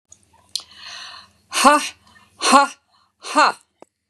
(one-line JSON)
{"exhalation_length": "4.1 s", "exhalation_amplitude": 32767, "exhalation_signal_mean_std_ratio": 0.34, "survey_phase": "beta (2021-08-13 to 2022-03-07)", "age": "45-64", "gender": "Female", "wearing_mask": "No", "symptom_none": true, "smoker_status": "Ex-smoker", "respiratory_condition_asthma": false, "respiratory_condition_other": false, "recruitment_source": "REACT", "submission_delay": "2 days", "covid_test_result": "Negative", "covid_test_method": "RT-qPCR", "influenza_a_test_result": "Negative", "influenza_b_test_result": "Negative"}